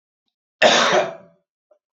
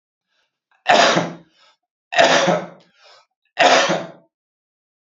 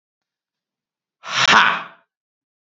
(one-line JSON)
{"cough_length": "2.0 s", "cough_amplitude": 27041, "cough_signal_mean_std_ratio": 0.4, "three_cough_length": "5.0 s", "three_cough_amplitude": 30684, "three_cough_signal_mean_std_ratio": 0.42, "exhalation_length": "2.6 s", "exhalation_amplitude": 31314, "exhalation_signal_mean_std_ratio": 0.32, "survey_phase": "beta (2021-08-13 to 2022-03-07)", "age": "18-44", "gender": "Male", "wearing_mask": "No", "symptom_none": true, "smoker_status": "Never smoked", "respiratory_condition_asthma": false, "respiratory_condition_other": false, "recruitment_source": "REACT", "submission_delay": "0 days", "covid_test_result": "Negative", "covid_test_method": "RT-qPCR", "influenza_a_test_result": "Negative", "influenza_b_test_result": "Negative"}